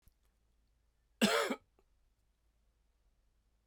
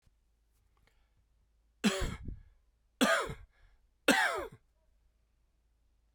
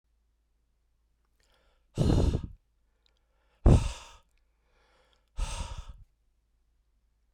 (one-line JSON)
{"cough_length": "3.7 s", "cough_amplitude": 5179, "cough_signal_mean_std_ratio": 0.24, "three_cough_length": "6.1 s", "three_cough_amplitude": 9204, "three_cough_signal_mean_std_ratio": 0.32, "exhalation_length": "7.3 s", "exhalation_amplitude": 11713, "exhalation_signal_mean_std_ratio": 0.27, "survey_phase": "beta (2021-08-13 to 2022-03-07)", "age": "45-64", "gender": "Male", "wearing_mask": "No", "symptom_cough_any": true, "symptom_runny_or_blocked_nose": true, "symptom_fatigue": true, "symptom_fever_high_temperature": true, "symptom_change_to_sense_of_smell_or_taste": true, "symptom_loss_of_taste": true, "symptom_other": true, "symptom_onset": "2 days", "smoker_status": "Never smoked", "respiratory_condition_asthma": false, "respiratory_condition_other": true, "recruitment_source": "Test and Trace", "submission_delay": "1 day", "covid_test_result": "Positive", "covid_test_method": "RT-qPCR", "covid_ct_value": 13.6, "covid_ct_gene": "N gene", "covid_ct_mean": 13.9, "covid_viral_load": "29000000 copies/ml", "covid_viral_load_category": "High viral load (>1M copies/ml)"}